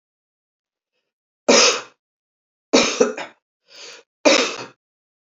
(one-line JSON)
{"three_cough_length": "5.2 s", "three_cough_amplitude": 29896, "three_cough_signal_mean_std_ratio": 0.33, "survey_phase": "beta (2021-08-13 to 2022-03-07)", "age": "45-64", "gender": "Female", "wearing_mask": "No", "symptom_cough_any": true, "symptom_runny_or_blocked_nose": true, "symptom_fatigue": true, "symptom_onset": "4 days", "smoker_status": "Current smoker (1 to 10 cigarettes per day)", "respiratory_condition_asthma": false, "respiratory_condition_other": false, "recruitment_source": "Test and Trace", "submission_delay": "2 days", "covid_test_result": "Positive", "covid_test_method": "ePCR"}